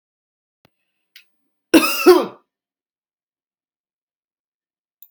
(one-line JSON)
{"cough_length": "5.1 s", "cough_amplitude": 32768, "cough_signal_mean_std_ratio": 0.21, "survey_phase": "beta (2021-08-13 to 2022-03-07)", "age": "45-64", "gender": "Female", "wearing_mask": "No", "symptom_none": true, "smoker_status": "Never smoked", "respiratory_condition_asthma": false, "respiratory_condition_other": false, "recruitment_source": "REACT", "submission_delay": "0 days", "covid_test_result": "Negative", "covid_test_method": "RT-qPCR", "influenza_a_test_result": "Unknown/Void", "influenza_b_test_result": "Unknown/Void"}